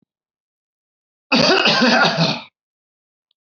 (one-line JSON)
{"cough_length": "3.6 s", "cough_amplitude": 26866, "cough_signal_mean_std_ratio": 0.46, "survey_phase": "beta (2021-08-13 to 2022-03-07)", "age": "45-64", "gender": "Male", "wearing_mask": "No", "symptom_none": true, "smoker_status": "Never smoked", "respiratory_condition_asthma": true, "respiratory_condition_other": false, "recruitment_source": "REACT", "submission_delay": "1 day", "covid_test_result": "Negative", "covid_test_method": "RT-qPCR"}